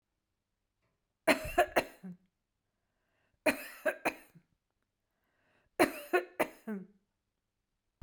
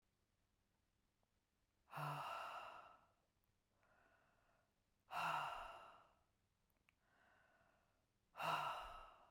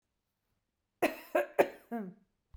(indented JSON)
{
  "three_cough_length": "8.0 s",
  "three_cough_amplitude": 10382,
  "three_cough_signal_mean_std_ratio": 0.27,
  "exhalation_length": "9.3 s",
  "exhalation_amplitude": 1008,
  "exhalation_signal_mean_std_ratio": 0.41,
  "cough_length": "2.6 s",
  "cough_amplitude": 7994,
  "cough_signal_mean_std_ratio": 0.3,
  "survey_phase": "beta (2021-08-13 to 2022-03-07)",
  "age": "45-64",
  "gender": "Female",
  "wearing_mask": "No",
  "symptom_none": true,
  "smoker_status": "Never smoked",
  "respiratory_condition_asthma": false,
  "respiratory_condition_other": false,
  "recruitment_source": "REACT",
  "submission_delay": "2 days",
  "covid_test_result": "Negative",
  "covid_test_method": "RT-qPCR",
  "influenza_a_test_result": "Negative",
  "influenza_b_test_result": "Negative"
}